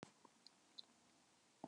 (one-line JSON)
{"cough_length": "1.7 s", "cough_amplitude": 559, "cough_signal_mean_std_ratio": 0.39, "survey_phase": "beta (2021-08-13 to 2022-03-07)", "age": "65+", "gender": "Female", "wearing_mask": "No", "symptom_none": true, "smoker_status": "Ex-smoker", "respiratory_condition_asthma": false, "respiratory_condition_other": false, "recruitment_source": "REACT", "submission_delay": "6 days", "covid_test_result": "Negative", "covid_test_method": "RT-qPCR", "influenza_a_test_result": "Negative", "influenza_b_test_result": "Negative"}